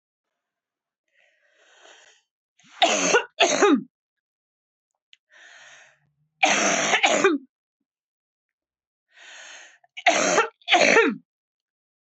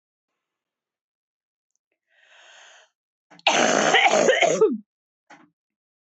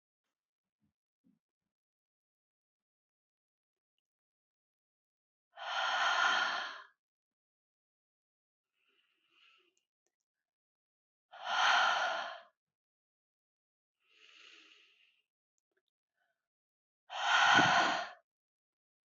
{"three_cough_length": "12.1 s", "three_cough_amplitude": 23438, "three_cough_signal_mean_std_ratio": 0.38, "cough_length": "6.1 s", "cough_amplitude": 24054, "cough_signal_mean_std_ratio": 0.37, "exhalation_length": "19.1 s", "exhalation_amplitude": 7173, "exhalation_signal_mean_std_ratio": 0.3, "survey_phase": "beta (2021-08-13 to 2022-03-07)", "age": "45-64", "gender": "Female", "wearing_mask": "No", "symptom_sore_throat": true, "symptom_onset": "2 days", "smoker_status": "Never smoked", "respiratory_condition_asthma": false, "respiratory_condition_other": false, "recruitment_source": "REACT", "submission_delay": "1 day", "covid_test_result": "Negative", "covid_test_method": "RT-qPCR"}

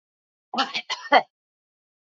{"cough_length": "2.0 s", "cough_amplitude": 25312, "cough_signal_mean_std_ratio": 0.28, "survey_phase": "beta (2021-08-13 to 2022-03-07)", "age": "45-64", "gender": "Female", "wearing_mask": "No", "symptom_none": true, "smoker_status": "Never smoked", "respiratory_condition_asthma": false, "respiratory_condition_other": false, "recruitment_source": "REACT", "submission_delay": "1 day", "covid_test_result": "Negative", "covid_test_method": "RT-qPCR"}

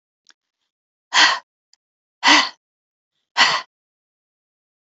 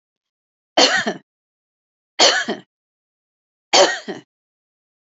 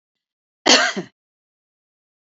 {"exhalation_length": "4.9 s", "exhalation_amplitude": 31959, "exhalation_signal_mean_std_ratio": 0.29, "three_cough_length": "5.1 s", "three_cough_amplitude": 32767, "three_cough_signal_mean_std_ratio": 0.32, "cough_length": "2.2 s", "cough_amplitude": 32124, "cough_signal_mean_std_ratio": 0.27, "survey_phase": "beta (2021-08-13 to 2022-03-07)", "age": "65+", "gender": "Female", "wearing_mask": "No", "symptom_cough_any": true, "symptom_runny_or_blocked_nose": true, "symptom_onset": "4 days", "smoker_status": "Never smoked", "respiratory_condition_asthma": true, "respiratory_condition_other": false, "recruitment_source": "Test and Trace", "submission_delay": "1 day", "covid_test_result": "Positive", "covid_test_method": "RT-qPCR", "covid_ct_value": 20.4, "covid_ct_gene": "ORF1ab gene", "covid_ct_mean": 21.2, "covid_viral_load": "110000 copies/ml", "covid_viral_load_category": "Low viral load (10K-1M copies/ml)"}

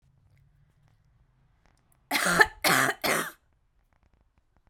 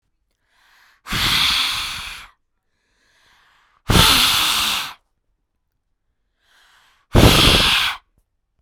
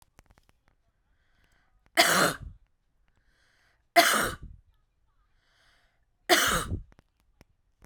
{"cough_length": "4.7 s", "cough_amplitude": 22710, "cough_signal_mean_std_ratio": 0.33, "exhalation_length": "8.6 s", "exhalation_amplitude": 32768, "exhalation_signal_mean_std_ratio": 0.44, "three_cough_length": "7.9 s", "three_cough_amplitude": 20318, "three_cough_signal_mean_std_ratio": 0.3, "survey_phase": "beta (2021-08-13 to 2022-03-07)", "age": "18-44", "gender": "Female", "wearing_mask": "No", "symptom_none": true, "smoker_status": "Ex-smoker", "respiratory_condition_asthma": false, "respiratory_condition_other": false, "recruitment_source": "REACT", "submission_delay": "4 days", "covid_test_result": "Negative", "covid_test_method": "RT-qPCR"}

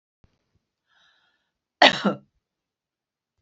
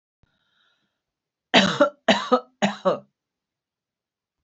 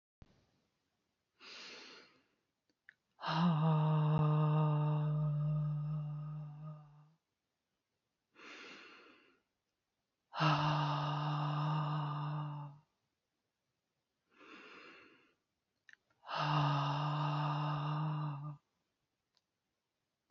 {"cough_length": "3.4 s", "cough_amplitude": 31796, "cough_signal_mean_std_ratio": 0.19, "three_cough_length": "4.4 s", "three_cough_amplitude": 28217, "three_cough_signal_mean_std_ratio": 0.31, "exhalation_length": "20.3 s", "exhalation_amplitude": 3234, "exhalation_signal_mean_std_ratio": 0.59, "survey_phase": "beta (2021-08-13 to 2022-03-07)", "age": "45-64", "gender": "Female", "wearing_mask": "No", "symptom_none": true, "smoker_status": "Never smoked", "respiratory_condition_asthma": false, "respiratory_condition_other": false, "recruitment_source": "REACT", "submission_delay": "2 days", "covid_test_result": "Negative", "covid_test_method": "RT-qPCR", "influenza_a_test_result": "Negative", "influenza_b_test_result": "Negative"}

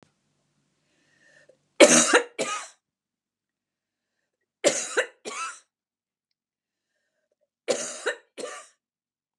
{"three_cough_length": "9.4 s", "three_cough_amplitude": 30810, "three_cough_signal_mean_std_ratio": 0.25, "survey_phase": "beta (2021-08-13 to 2022-03-07)", "age": "65+", "gender": "Female", "wearing_mask": "No", "symptom_cough_any": true, "symptom_runny_or_blocked_nose": true, "symptom_sore_throat": true, "symptom_fatigue": true, "symptom_fever_high_temperature": true, "smoker_status": "Ex-smoker", "respiratory_condition_asthma": false, "respiratory_condition_other": false, "recruitment_source": "REACT", "submission_delay": "3 days", "covid_test_result": "Negative", "covid_test_method": "RT-qPCR"}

